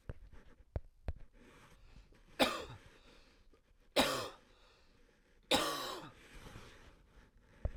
{
  "three_cough_length": "7.8 s",
  "three_cough_amplitude": 6263,
  "three_cough_signal_mean_std_ratio": 0.36,
  "survey_phase": "beta (2021-08-13 to 2022-03-07)",
  "age": "18-44",
  "gender": "Male",
  "wearing_mask": "No",
  "symptom_fatigue": true,
  "symptom_headache": true,
  "symptom_change_to_sense_of_smell_or_taste": true,
  "symptom_other": true,
  "symptom_onset": "2 days",
  "smoker_status": "Never smoked",
  "respiratory_condition_asthma": false,
  "respiratory_condition_other": false,
  "recruitment_source": "Test and Trace",
  "submission_delay": "1 day",
  "covid_test_result": "Positive",
  "covid_test_method": "RT-qPCR",
  "covid_ct_value": 19.4,
  "covid_ct_gene": "ORF1ab gene"
}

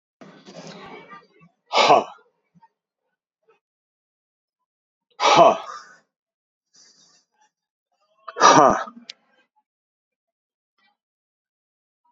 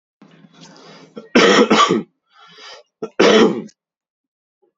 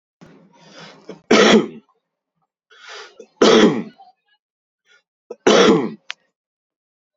{
  "exhalation_length": "12.1 s",
  "exhalation_amplitude": 32768,
  "exhalation_signal_mean_std_ratio": 0.24,
  "cough_length": "4.8 s",
  "cough_amplitude": 32098,
  "cough_signal_mean_std_ratio": 0.4,
  "three_cough_length": "7.2 s",
  "three_cough_amplitude": 29380,
  "three_cough_signal_mean_std_ratio": 0.34,
  "survey_phase": "beta (2021-08-13 to 2022-03-07)",
  "age": "18-44",
  "gender": "Male",
  "wearing_mask": "No",
  "symptom_shortness_of_breath": true,
  "symptom_change_to_sense_of_smell_or_taste": true,
  "symptom_loss_of_taste": true,
  "symptom_onset": "12 days",
  "smoker_status": "Current smoker (11 or more cigarettes per day)",
  "respiratory_condition_asthma": false,
  "respiratory_condition_other": false,
  "recruitment_source": "REACT",
  "submission_delay": "1 day",
  "covid_test_result": "Positive",
  "covid_test_method": "RT-qPCR",
  "covid_ct_value": 37.0,
  "covid_ct_gene": "E gene",
  "influenza_a_test_result": "Unknown/Void",
  "influenza_b_test_result": "Unknown/Void"
}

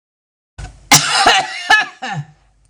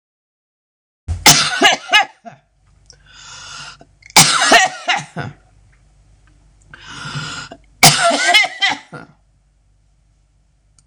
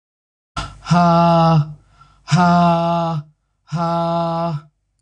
{
  "cough_length": "2.7 s",
  "cough_amplitude": 26028,
  "cough_signal_mean_std_ratio": 0.48,
  "three_cough_length": "10.9 s",
  "three_cough_amplitude": 26028,
  "three_cough_signal_mean_std_ratio": 0.39,
  "exhalation_length": "5.0 s",
  "exhalation_amplitude": 22897,
  "exhalation_signal_mean_std_ratio": 0.73,
  "survey_phase": "beta (2021-08-13 to 2022-03-07)",
  "age": "45-64",
  "gender": "Female",
  "wearing_mask": "No",
  "symptom_cough_any": true,
  "symptom_runny_or_blocked_nose": true,
  "symptom_sore_throat": true,
  "symptom_fatigue": true,
  "symptom_onset": "12 days",
  "smoker_status": "Ex-smoker",
  "respiratory_condition_asthma": false,
  "respiratory_condition_other": false,
  "recruitment_source": "REACT",
  "submission_delay": "2 days",
  "covid_test_result": "Positive",
  "covid_test_method": "RT-qPCR",
  "covid_ct_value": 33.1,
  "covid_ct_gene": "N gene",
  "influenza_a_test_result": "Negative",
  "influenza_b_test_result": "Negative"
}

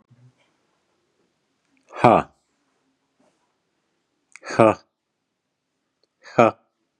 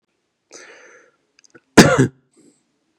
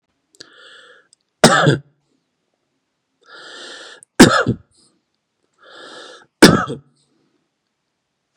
{
  "exhalation_length": "7.0 s",
  "exhalation_amplitude": 32767,
  "exhalation_signal_mean_std_ratio": 0.19,
  "cough_length": "3.0 s",
  "cough_amplitude": 32768,
  "cough_signal_mean_std_ratio": 0.24,
  "three_cough_length": "8.4 s",
  "three_cough_amplitude": 32768,
  "three_cough_signal_mean_std_ratio": 0.25,
  "survey_phase": "beta (2021-08-13 to 2022-03-07)",
  "age": "18-44",
  "gender": "Male",
  "wearing_mask": "No",
  "symptom_none": true,
  "smoker_status": "Never smoked",
  "respiratory_condition_asthma": false,
  "respiratory_condition_other": false,
  "recruitment_source": "REACT",
  "submission_delay": "2 days",
  "covid_test_result": "Negative",
  "covid_test_method": "RT-qPCR",
  "influenza_a_test_result": "Negative",
  "influenza_b_test_result": "Negative"
}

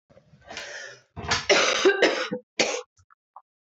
{
  "cough_length": "3.7 s",
  "cough_amplitude": 16850,
  "cough_signal_mean_std_ratio": 0.48,
  "survey_phase": "beta (2021-08-13 to 2022-03-07)",
  "age": "45-64",
  "gender": "Female",
  "wearing_mask": "No",
  "symptom_cough_any": true,
  "symptom_sore_throat": true,
  "symptom_fatigue": true,
  "symptom_headache": true,
  "smoker_status": "Never smoked",
  "respiratory_condition_asthma": false,
  "respiratory_condition_other": false,
  "recruitment_source": "Test and Trace",
  "submission_delay": "10 days",
  "covid_test_result": "Negative",
  "covid_test_method": "RT-qPCR"
}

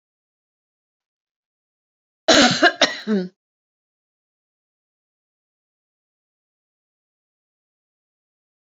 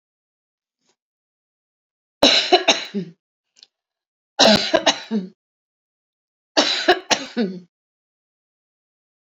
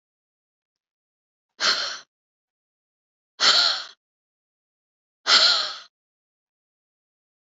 {
  "cough_length": "8.8 s",
  "cough_amplitude": 30658,
  "cough_signal_mean_std_ratio": 0.21,
  "three_cough_length": "9.4 s",
  "three_cough_amplitude": 29167,
  "three_cough_signal_mean_std_ratio": 0.32,
  "exhalation_length": "7.4 s",
  "exhalation_amplitude": 21333,
  "exhalation_signal_mean_std_ratio": 0.3,
  "survey_phase": "beta (2021-08-13 to 2022-03-07)",
  "age": "65+",
  "gender": "Female",
  "wearing_mask": "No",
  "symptom_none": true,
  "smoker_status": "Never smoked",
  "respiratory_condition_asthma": false,
  "respiratory_condition_other": false,
  "recruitment_source": "REACT",
  "submission_delay": "2 days",
  "covid_test_result": "Negative",
  "covid_test_method": "RT-qPCR",
  "influenza_a_test_result": "Negative",
  "influenza_b_test_result": "Negative"
}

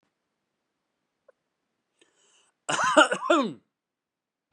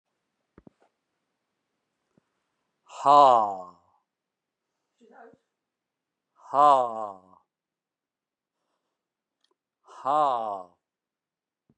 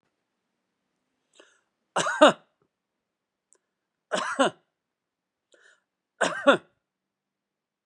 {
  "cough_length": "4.5 s",
  "cough_amplitude": 24247,
  "cough_signal_mean_std_ratio": 0.28,
  "exhalation_length": "11.8 s",
  "exhalation_amplitude": 20021,
  "exhalation_signal_mean_std_ratio": 0.24,
  "three_cough_length": "7.9 s",
  "three_cough_amplitude": 27686,
  "three_cough_signal_mean_std_ratio": 0.22,
  "survey_phase": "beta (2021-08-13 to 2022-03-07)",
  "age": "65+",
  "gender": "Male",
  "wearing_mask": "No",
  "symptom_runny_or_blocked_nose": true,
  "smoker_status": "Never smoked",
  "respiratory_condition_asthma": false,
  "respiratory_condition_other": false,
  "recruitment_source": "REACT",
  "submission_delay": "2 days",
  "covid_test_result": "Negative",
  "covid_test_method": "RT-qPCR",
  "influenza_a_test_result": "Negative",
  "influenza_b_test_result": "Negative"
}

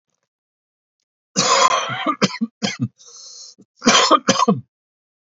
{
  "cough_length": "5.4 s",
  "cough_amplitude": 32767,
  "cough_signal_mean_std_ratio": 0.44,
  "survey_phase": "alpha (2021-03-01 to 2021-08-12)",
  "age": "45-64",
  "gender": "Male",
  "wearing_mask": "No",
  "symptom_cough_any": true,
  "symptom_fatigue": true,
  "symptom_headache": true,
  "smoker_status": "Never smoked",
  "respiratory_condition_asthma": false,
  "respiratory_condition_other": false,
  "recruitment_source": "Test and Trace",
  "submission_delay": "2 days",
  "covid_test_result": "Positive",
  "covid_test_method": "RT-qPCR",
  "covid_ct_value": 22.4,
  "covid_ct_gene": "ORF1ab gene",
  "covid_ct_mean": 23.1,
  "covid_viral_load": "27000 copies/ml",
  "covid_viral_load_category": "Low viral load (10K-1M copies/ml)"
}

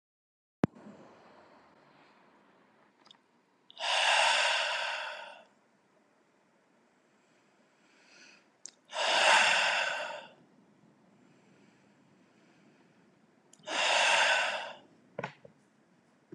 {
  "exhalation_length": "16.3 s",
  "exhalation_amplitude": 9732,
  "exhalation_signal_mean_std_ratio": 0.39,
  "survey_phase": "beta (2021-08-13 to 2022-03-07)",
  "age": "18-44",
  "gender": "Male",
  "wearing_mask": "No",
  "symptom_cough_any": true,
  "symptom_sore_throat": true,
  "symptom_other": true,
  "smoker_status": "Never smoked",
  "respiratory_condition_asthma": false,
  "respiratory_condition_other": false,
  "recruitment_source": "Test and Trace",
  "submission_delay": "1 day",
  "covid_test_result": "Negative",
  "covid_test_method": "RT-qPCR"
}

